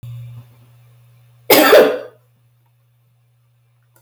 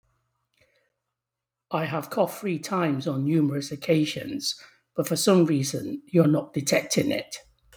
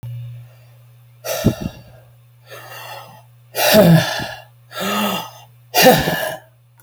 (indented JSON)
{
  "cough_length": "4.0 s",
  "cough_amplitude": 32768,
  "cough_signal_mean_std_ratio": 0.31,
  "three_cough_length": "7.8 s",
  "three_cough_amplitude": 15739,
  "three_cough_signal_mean_std_ratio": 0.6,
  "exhalation_length": "6.8 s",
  "exhalation_amplitude": 32768,
  "exhalation_signal_mean_std_ratio": 0.46,
  "survey_phase": "beta (2021-08-13 to 2022-03-07)",
  "age": "45-64",
  "gender": "Male",
  "wearing_mask": "No",
  "symptom_none": true,
  "smoker_status": "Never smoked",
  "respiratory_condition_asthma": false,
  "respiratory_condition_other": false,
  "recruitment_source": "REACT",
  "submission_delay": "1 day",
  "covid_test_result": "Negative",
  "covid_test_method": "RT-qPCR"
}